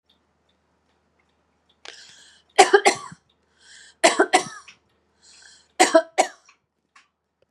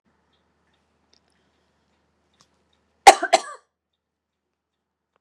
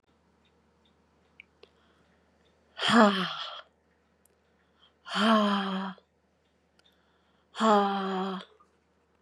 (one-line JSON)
{"three_cough_length": "7.5 s", "three_cough_amplitude": 32768, "three_cough_signal_mean_std_ratio": 0.25, "cough_length": "5.2 s", "cough_amplitude": 32768, "cough_signal_mean_std_ratio": 0.13, "exhalation_length": "9.2 s", "exhalation_amplitude": 18273, "exhalation_signal_mean_std_ratio": 0.35, "survey_phase": "beta (2021-08-13 to 2022-03-07)", "age": "65+", "gender": "Female", "wearing_mask": "No", "symptom_none": true, "smoker_status": "Never smoked", "respiratory_condition_asthma": false, "respiratory_condition_other": false, "recruitment_source": "REACT", "submission_delay": "1 day", "covid_test_result": "Negative", "covid_test_method": "RT-qPCR", "influenza_a_test_result": "Negative", "influenza_b_test_result": "Negative"}